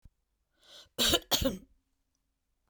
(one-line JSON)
{"cough_length": "2.7 s", "cough_amplitude": 10107, "cough_signal_mean_std_ratio": 0.32, "survey_phase": "beta (2021-08-13 to 2022-03-07)", "age": "65+", "gender": "Female", "wearing_mask": "No", "symptom_none": true, "smoker_status": "Never smoked", "respiratory_condition_asthma": false, "respiratory_condition_other": false, "recruitment_source": "REACT", "submission_delay": "2 days", "covid_test_result": "Negative", "covid_test_method": "RT-qPCR"}